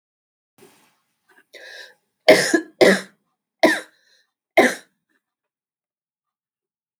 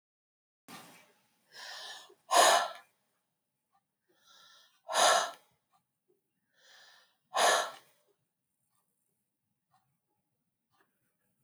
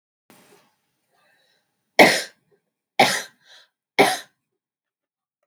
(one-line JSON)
{"cough_length": "7.0 s", "cough_amplitude": 32767, "cough_signal_mean_std_ratio": 0.26, "exhalation_length": "11.4 s", "exhalation_amplitude": 9480, "exhalation_signal_mean_std_ratio": 0.26, "three_cough_length": "5.5 s", "three_cough_amplitude": 32767, "three_cough_signal_mean_std_ratio": 0.24, "survey_phase": "beta (2021-08-13 to 2022-03-07)", "age": "45-64", "gender": "Female", "wearing_mask": "No", "symptom_none": true, "smoker_status": "Ex-smoker", "respiratory_condition_asthma": false, "respiratory_condition_other": false, "recruitment_source": "REACT", "submission_delay": "5 days", "covid_test_result": "Negative", "covid_test_method": "RT-qPCR", "influenza_a_test_result": "Negative", "influenza_b_test_result": "Negative"}